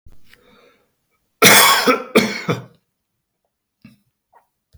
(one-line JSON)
{"cough_length": "4.8 s", "cough_amplitude": 32768, "cough_signal_mean_std_ratio": 0.33, "survey_phase": "beta (2021-08-13 to 2022-03-07)", "age": "65+", "gender": "Male", "wearing_mask": "No", "symptom_none": true, "smoker_status": "Never smoked", "respiratory_condition_asthma": false, "respiratory_condition_other": false, "recruitment_source": "REACT", "submission_delay": "2 days", "covid_test_result": "Negative", "covid_test_method": "RT-qPCR", "influenza_a_test_result": "Negative", "influenza_b_test_result": "Negative"}